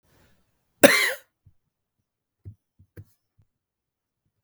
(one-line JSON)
{"cough_length": "4.4 s", "cough_amplitude": 32768, "cough_signal_mean_std_ratio": 0.18, "survey_phase": "beta (2021-08-13 to 2022-03-07)", "age": "45-64", "gender": "Male", "wearing_mask": "No", "symptom_none": true, "smoker_status": "Ex-smoker", "respiratory_condition_asthma": true, "respiratory_condition_other": false, "recruitment_source": "Test and Trace", "submission_delay": "1 day", "covid_test_result": "Positive", "covid_test_method": "ePCR"}